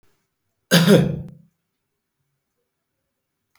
{"cough_length": "3.6 s", "cough_amplitude": 32618, "cough_signal_mean_std_ratio": 0.28, "survey_phase": "beta (2021-08-13 to 2022-03-07)", "age": "65+", "gender": "Male", "wearing_mask": "No", "symptom_none": true, "smoker_status": "Ex-smoker", "respiratory_condition_asthma": false, "respiratory_condition_other": false, "recruitment_source": "REACT", "submission_delay": "3 days", "covid_test_result": "Negative", "covid_test_method": "RT-qPCR", "influenza_a_test_result": "Negative", "influenza_b_test_result": "Negative"}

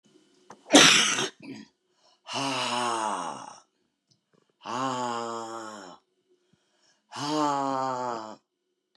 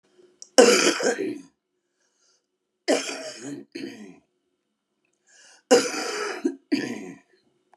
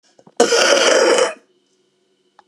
{"exhalation_length": "9.0 s", "exhalation_amplitude": 28236, "exhalation_signal_mean_std_ratio": 0.42, "three_cough_length": "7.8 s", "three_cough_amplitude": 32744, "three_cough_signal_mean_std_ratio": 0.36, "cough_length": "2.5 s", "cough_amplitude": 32767, "cough_signal_mean_std_ratio": 0.54, "survey_phase": "beta (2021-08-13 to 2022-03-07)", "age": "65+", "gender": "Female", "wearing_mask": "No", "symptom_cough_any": true, "symptom_change_to_sense_of_smell_or_taste": true, "symptom_loss_of_taste": true, "symptom_onset": "13 days", "smoker_status": "Current smoker (11 or more cigarettes per day)", "respiratory_condition_asthma": true, "respiratory_condition_other": true, "recruitment_source": "REACT", "submission_delay": "2 days", "covid_test_result": "Negative", "covid_test_method": "RT-qPCR"}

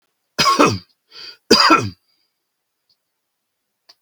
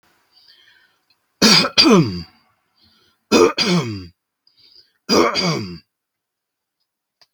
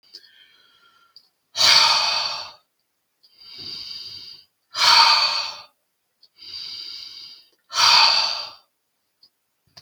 {"cough_length": "4.0 s", "cough_amplitude": 32768, "cough_signal_mean_std_ratio": 0.34, "three_cough_length": "7.3 s", "three_cough_amplitude": 32768, "three_cough_signal_mean_std_ratio": 0.39, "exhalation_length": "9.8 s", "exhalation_amplitude": 31796, "exhalation_signal_mean_std_ratio": 0.41, "survey_phase": "beta (2021-08-13 to 2022-03-07)", "age": "65+", "gender": "Male", "wearing_mask": "No", "symptom_none": true, "smoker_status": "Ex-smoker", "respiratory_condition_asthma": false, "respiratory_condition_other": false, "recruitment_source": "REACT", "submission_delay": "1 day", "covid_test_result": "Negative", "covid_test_method": "RT-qPCR", "influenza_a_test_result": "Negative", "influenza_b_test_result": "Negative"}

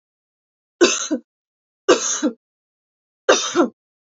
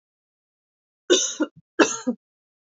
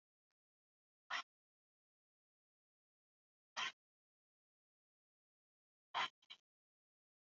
{"three_cough_length": "4.1 s", "three_cough_amplitude": 32360, "three_cough_signal_mean_std_ratio": 0.37, "cough_length": "2.6 s", "cough_amplitude": 26682, "cough_signal_mean_std_ratio": 0.32, "exhalation_length": "7.3 s", "exhalation_amplitude": 1190, "exhalation_signal_mean_std_ratio": 0.18, "survey_phase": "alpha (2021-03-01 to 2021-08-12)", "age": "18-44", "gender": "Female", "wearing_mask": "No", "symptom_cough_any": true, "symptom_shortness_of_breath": true, "symptom_diarrhoea": true, "symptom_fatigue": true, "symptom_headache": true, "symptom_change_to_sense_of_smell_or_taste": true, "symptom_onset": "6 days", "smoker_status": "Current smoker (1 to 10 cigarettes per day)", "respiratory_condition_asthma": false, "respiratory_condition_other": false, "recruitment_source": "Test and Trace", "submission_delay": "1 day", "covid_test_result": "Positive", "covid_test_method": "RT-qPCR"}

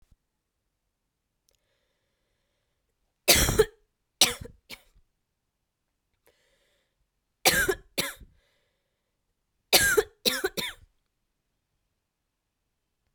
{"three_cough_length": "13.1 s", "three_cough_amplitude": 25807, "three_cough_signal_mean_std_ratio": 0.25, "survey_phase": "alpha (2021-03-01 to 2021-08-12)", "age": "18-44", "gender": "Female", "wearing_mask": "No", "symptom_new_continuous_cough": true, "symptom_shortness_of_breath": true, "symptom_abdominal_pain": true, "symptom_fatigue": true, "symptom_fever_high_temperature": true, "symptom_headache": true, "symptom_change_to_sense_of_smell_or_taste": true, "symptom_loss_of_taste": true, "symptom_onset": "3 days", "smoker_status": "Never smoked", "respiratory_condition_asthma": false, "respiratory_condition_other": false, "recruitment_source": "Test and Trace", "submission_delay": "1 day", "covid_test_result": "Positive", "covid_test_method": "RT-qPCR"}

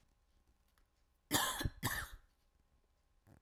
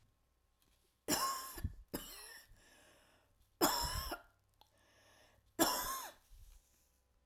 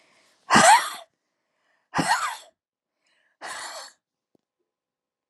{"cough_length": "3.4 s", "cough_amplitude": 3669, "cough_signal_mean_std_ratio": 0.35, "three_cough_length": "7.3 s", "three_cough_amplitude": 5048, "three_cough_signal_mean_std_ratio": 0.39, "exhalation_length": "5.3 s", "exhalation_amplitude": 21882, "exhalation_signal_mean_std_ratio": 0.29, "survey_phase": "alpha (2021-03-01 to 2021-08-12)", "age": "18-44", "gender": "Female", "wearing_mask": "No", "symptom_headache": true, "smoker_status": "Never smoked", "respiratory_condition_asthma": true, "respiratory_condition_other": false, "recruitment_source": "Test and Trace", "submission_delay": "1 day", "covid_test_result": "Positive", "covid_test_method": "RT-qPCR", "covid_ct_value": 21.5, "covid_ct_gene": "ORF1ab gene", "covid_ct_mean": 22.1, "covid_viral_load": "57000 copies/ml", "covid_viral_load_category": "Low viral load (10K-1M copies/ml)"}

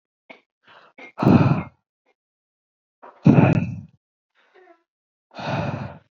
{"exhalation_length": "6.1 s", "exhalation_amplitude": 27511, "exhalation_signal_mean_std_ratio": 0.33, "survey_phase": "beta (2021-08-13 to 2022-03-07)", "age": "18-44", "gender": "Male", "wearing_mask": "No", "symptom_cough_any": true, "symptom_new_continuous_cough": true, "symptom_runny_or_blocked_nose": true, "symptom_sore_throat": true, "symptom_onset": "11 days", "smoker_status": "Ex-smoker", "respiratory_condition_asthma": false, "respiratory_condition_other": false, "recruitment_source": "REACT", "submission_delay": "1 day", "covid_test_result": "Negative", "covid_test_method": "RT-qPCR"}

